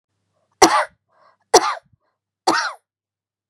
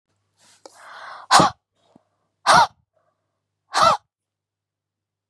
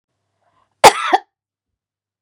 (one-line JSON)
{"three_cough_length": "3.5 s", "three_cough_amplitude": 32768, "three_cough_signal_mean_std_ratio": 0.3, "exhalation_length": "5.3 s", "exhalation_amplitude": 32746, "exhalation_signal_mean_std_ratio": 0.28, "cough_length": "2.2 s", "cough_amplitude": 32768, "cough_signal_mean_std_ratio": 0.23, "survey_phase": "beta (2021-08-13 to 2022-03-07)", "age": "45-64", "gender": "Female", "wearing_mask": "No", "symptom_none": true, "smoker_status": "Never smoked", "respiratory_condition_asthma": false, "respiratory_condition_other": false, "recruitment_source": "REACT", "submission_delay": "3 days", "covid_test_result": "Negative", "covid_test_method": "RT-qPCR", "influenza_a_test_result": "Negative", "influenza_b_test_result": "Negative"}